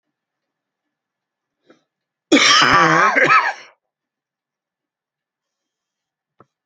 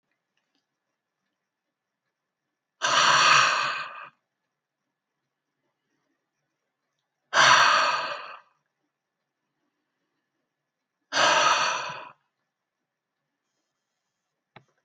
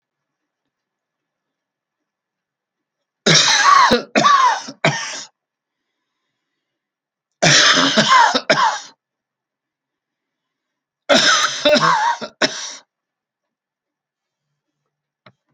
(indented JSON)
{
  "cough_length": "6.7 s",
  "cough_amplitude": 32767,
  "cough_signal_mean_std_ratio": 0.35,
  "exhalation_length": "14.8 s",
  "exhalation_amplitude": 19254,
  "exhalation_signal_mean_std_ratio": 0.33,
  "three_cough_length": "15.5 s",
  "three_cough_amplitude": 32768,
  "three_cough_signal_mean_std_ratio": 0.41,
  "survey_phase": "beta (2021-08-13 to 2022-03-07)",
  "age": "65+",
  "gender": "Male",
  "wearing_mask": "No",
  "symptom_none": true,
  "smoker_status": "Never smoked",
  "respiratory_condition_asthma": false,
  "respiratory_condition_other": false,
  "recruitment_source": "REACT",
  "submission_delay": "2 days",
  "covid_test_result": "Negative",
  "covid_test_method": "RT-qPCR"
}